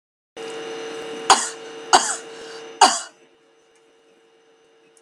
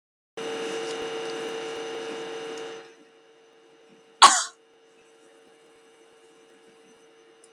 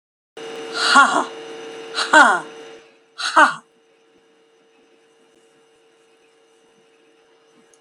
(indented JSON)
{
  "three_cough_length": "5.0 s",
  "three_cough_amplitude": 32768,
  "three_cough_signal_mean_std_ratio": 0.33,
  "cough_length": "7.5 s",
  "cough_amplitude": 32562,
  "cough_signal_mean_std_ratio": 0.31,
  "exhalation_length": "7.8 s",
  "exhalation_amplitude": 32767,
  "exhalation_signal_mean_std_ratio": 0.32,
  "survey_phase": "beta (2021-08-13 to 2022-03-07)",
  "age": "65+",
  "gender": "Female",
  "wearing_mask": "No",
  "symptom_none": true,
  "symptom_onset": "12 days",
  "smoker_status": "Never smoked",
  "respiratory_condition_asthma": false,
  "respiratory_condition_other": false,
  "recruitment_source": "REACT",
  "submission_delay": "1 day",
  "covid_test_result": "Negative",
  "covid_test_method": "RT-qPCR",
  "influenza_a_test_result": "Negative",
  "influenza_b_test_result": "Negative"
}